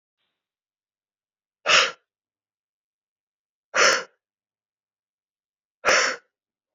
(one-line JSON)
{"exhalation_length": "6.7 s", "exhalation_amplitude": 24185, "exhalation_signal_mean_std_ratio": 0.26, "survey_phase": "beta (2021-08-13 to 2022-03-07)", "age": "45-64", "gender": "Male", "wearing_mask": "No", "symptom_cough_any": true, "symptom_fatigue": true, "symptom_onset": "5 days", "smoker_status": "Never smoked", "respiratory_condition_asthma": true, "respiratory_condition_other": false, "recruitment_source": "Test and Trace", "submission_delay": "2 days", "covid_test_result": "Positive", "covid_test_method": "RT-qPCR", "covid_ct_value": 22.8, "covid_ct_gene": "S gene", "covid_ct_mean": 23.2, "covid_viral_load": "24000 copies/ml", "covid_viral_load_category": "Low viral load (10K-1M copies/ml)"}